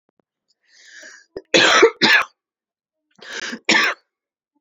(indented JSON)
{
  "cough_length": "4.6 s",
  "cough_amplitude": 31021,
  "cough_signal_mean_std_ratio": 0.37,
  "survey_phase": "beta (2021-08-13 to 2022-03-07)",
  "age": "18-44",
  "gender": "Female",
  "wearing_mask": "No",
  "symptom_none": true,
  "smoker_status": "Never smoked",
  "respiratory_condition_asthma": true,
  "respiratory_condition_other": false,
  "recruitment_source": "REACT",
  "submission_delay": "1 day",
  "covid_test_result": "Negative",
  "covid_test_method": "RT-qPCR",
  "influenza_a_test_result": "Unknown/Void",
  "influenza_b_test_result": "Unknown/Void"
}